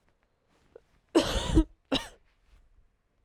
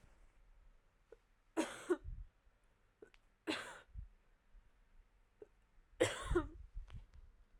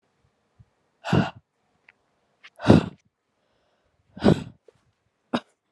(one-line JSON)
{"cough_length": "3.2 s", "cough_amplitude": 10161, "cough_signal_mean_std_ratio": 0.31, "three_cough_length": "7.6 s", "three_cough_amplitude": 3428, "three_cough_signal_mean_std_ratio": 0.35, "exhalation_length": "5.7 s", "exhalation_amplitude": 32601, "exhalation_signal_mean_std_ratio": 0.23, "survey_phase": "alpha (2021-03-01 to 2021-08-12)", "age": "18-44", "gender": "Female", "wearing_mask": "No", "symptom_cough_any": true, "symptom_shortness_of_breath": true, "symptom_abdominal_pain": true, "symptom_diarrhoea": true, "symptom_fatigue": true, "symptom_fever_high_temperature": true, "symptom_headache": true, "symptom_change_to_sense_of_smell_or_taste": true, "symptom_loss_of_taste": true, "symptom_onset": "5 days", "smoker_status": "Never smoked", "respiratory_condition_asthma": false, "respiratory_condition_other": false, "recruitment_source": "Test and Trace", "submission_delay": "2 days", "covid_test_result": "Positive", "covid_test_method": "RT-qPCR", "covid_ct_value": 22.6, "covid_ct_gene": "N gene"}